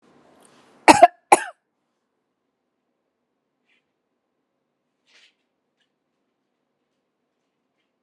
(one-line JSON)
{"cough_length": "8.0 s", "cough_amplitude": 32768, "cough_signal_mean_std_ratio": 0.12, "survey_phase": "alpha (2021-03-01 to 2021-08-12)", "age": "45-64", "gender": "Female", "wearing_mask": "No", "symptom_none": true, "smoker_status": "Never smoked", "respiratory_condition_asthma": false, "respiratory_condition_other": false, "recruitment_source": "REACT", "submission_delay": "2 days", "covid_test_result": "Negative", "covid_test_method": "RT-qPCR"}